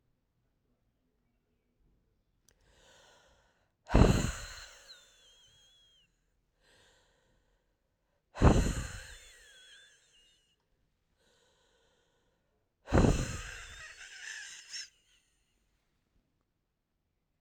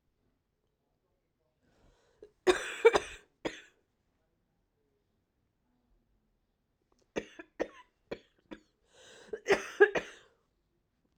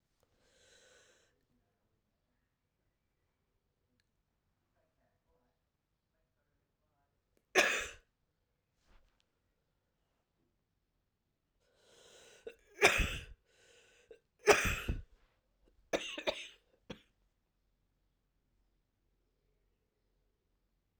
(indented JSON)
{
  "exhalation_length": "17.4 s",
  "exhalation_amplitude": 13591,
  "exhalation_signal_mean_std_ratio": 0.23,
  "cough_length": "11.2 s",
  "cough_amplitude": 12150,
  "cough_signal_mean_std_ratio": 0.2,
  "three_cough_length": "21.0 s",
  "three_cough_amplitude": 12124,
  "three_cough_signal_mean_std_ratio": 0.19,
  "survey_phase": "alpha (2021-03-01 to 2021-08-12)",
  "age": "45-64",
  "gender": "Female",
  "wearing_mask": "No",
  "symptom_cough_any": true,
  "symptom_new_continuous_cough": true,
  "symptom_shortness_of_breath": true,
  "symptom_fatigue": true,
  "symptom_headache": true,
  "symptom_change_to_sense_of_smell_or_taste": true,
  "symptom_onset": "3 days",
  "smoker_status": "Ex-smoker",
  "respiratory_condition_asthma": false,
  "respiratory_condition_other": false,
  "recruitment_source": "Test and Trace",
  "submission_delay": "1 day",
  "covid_test_result": "Positive",
  "covid_test_method": "RT-qPCR",
  "covid_ct_value": 19.9,
  "covid_ct_gene": "ORF1ab gene"
}